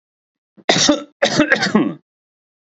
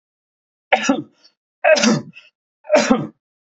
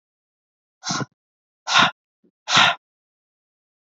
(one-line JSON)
{"cough_length": "2.6 s", "cough_amplitude": 32767, "cough_signal_mean_std_ratio": 0.48, "three_cough_length": "3.5 s", "three_cough_amplitude": 29047, "three_cough_signal_mean_std_ratio": 0.41, "exhalation_length": "3.8 s", "exhalation_amplitude": 26749, "exhalation_signal_mean_std_ratio": 0.3, "survey_phase": "beta (2021-08-13 to 2022-03-07)", "age": "45-64", "gender": "Male", "wearing_mask": "No", "symptom_none": true, "smoker_status": "Never smoked", "respiratory_condition_asthma": false, "respiratory_condition_other": false, "recruitment_source": "REACT", "submission_delay": "0 days", "covid_test_result": "Negative", "covid_test_method": "RT-qPCR", "influenza_a_test_result": "Negative", "influenza_b_test_result": "Negative"}